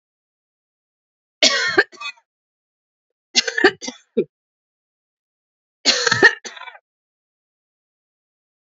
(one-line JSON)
{"three_cough_length": "8.8 s", "three_cough_amplitude": 32767, "three_cough_signal_mean_std_ratio": 0.27, "survey_phase": "alpha (2021-03-01 to 2021-08-12)", "age": "18-44", "gender": "Female", "wearing_mask": "No", "symptom_fatigue": true, "symptom_loss_of_taste": true, "symptom_onset": "3 days", "smoker_status": "Ex-smoker", "respiratory_condition_asthma": false, "respiratory_condition_other": false, "recruitment_source": "Test and Trace", "submission_delay": "2 days", "covid_test_result": "Positive", "covid_test_method": "RT-qPCR", "covid_ct_value": 20.8, "covid_ct_gene": "ORF1ab gene", "covid_ct_mean": 20.8, "covid_viral_load": "150000 copies/ml", "covid_viral_load_category": "Low viral load (10K-1M copies/ml)"}